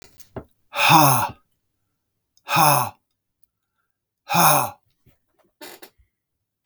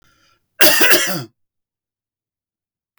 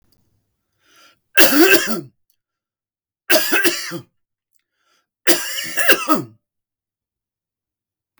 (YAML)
exhalation_length: 6.7 s
exhalation_amplitude: 32360
exhalation_signal_mean_std_ratio: 0.35
cough_length: 3.0 s
cough_amplitude: 32768
cough_signal_mean_std_ratio: 0.35
three_cough_length: 8.2 s
three_cough_amplitude: 32768
three_cough_signal_mean_std_ratio: 0.36
survey_phase: beta (2021-08-13 to 2022-03-07)
age: 65+
gender: Male
wearing_mask: 'No'
symptom_cough_any: true
symptom_runny_or_blocked_nose: true
symptom_fatigue: true
symptom_onset: 11 days
smoker_status: Never smoked
respiratory_condition_asthma: false
respiratory_condition_other: false
recruitment_source: REACT
submission_delay: 1 day
covid_test_result: Negative
covid_test_method: RT-qPCR
influenza_a_test_result: Negative
influenza_b_test_result: Negative